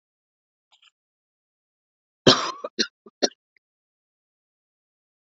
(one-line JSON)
{"three_cough_length": "5.4 s", "three_cough_amplitude": 27666, "three_cough_signal_mean_std_ratio": 0.17, "survey_phase": "beta (2021-08-13 to 2022-03-07)", "age": "45-64", "gender": "Female", "wearing_mask": "No", "symptom_none": true, "smoker_status": "Ex-smoker", "respiratory_condition_asthma": false, "respiratory_condition_other": false, "recruitment_source": "REACT", "submission_delay": "0 days", "covid_test_result": "Negative", "covid_test_method": "RT-qPCR", "influenza_a_test_result": "Negative", "influenza_b_test_result": "Negative"}